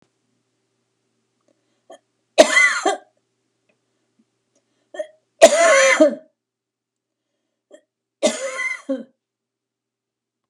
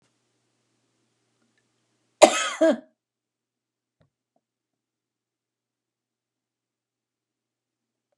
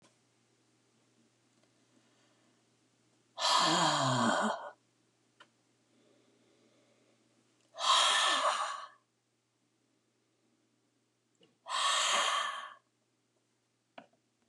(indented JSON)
{
  "three_cough_length": "10.5 s",
  "three_cough_amplitude": 32768,
  "three_cough_signal_mean_std_ratio": 0.29,
  "cough_length": "8.2 s",
  "cough_amplitude": 32768,
  "cough_signal_mean_std_ratio": 0.15,
  "exhalation_length": "14.5 s",
  "exhalation_amplitude": 5185,
  "exhalation_signal_mean_std_ratio": 0.39,
  "survey_phase": "beta (2021-08-13 to 2022-03-07)",
  "age": "65+",
  "gender": "Female",
  "wearing_mask": "No",
  "symptom_none": true,
  "smoker_status": "Ex-smoker",
  "respiratory_condition_asthma": false,
  "respiratory_condition_other": false,
  "recruitment_source": "REACT",
  "submission_delay": "1 day",
  "covid_test_result": "Negative",
  "covid_test_method": "RT-qPCR",
  "influenza_a_test_result": "Negative",
  "influenza_b_test_result": "Negative"
}